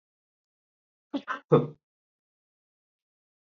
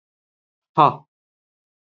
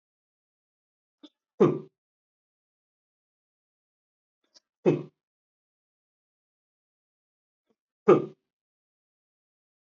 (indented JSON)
{
  "cough_length": "3.4 s",
  "cough_amplitude": 15405,
  "cough_signal_mean_std_ratio": 0.19,
  "exhalation_length": "2.0 s",
  "exhalation_amplitude": 27333,
  "exhalation_signal_mean_std_ratio": 0.19,
  "three_cough_length": "9.9 s",
  "three_cough_amplitude": 20824,
  "three_cough_signal_mean_std_ratio": 0.16,
  "survey_phase": "beta (2021-08-13 to 2022-03-07)",
  "age": "45-64",
  "gender": "Male",
  "wearing_mask": "No",
  "symptom_none": true,
  "smoker_status": "Ex-smoker",
  "respiratory_condition_asthma": false,
  "respiratory_condition_other": false,
  "recruitment_source": "REACT",
  "submission_delay": "6 days",
  "covid_test_result": "Negative",
  "covid_test_method": "RT-qPCR",
  "influenza_a_test_result": "Negative",
  "influenza_b_test_result": "Negative"
}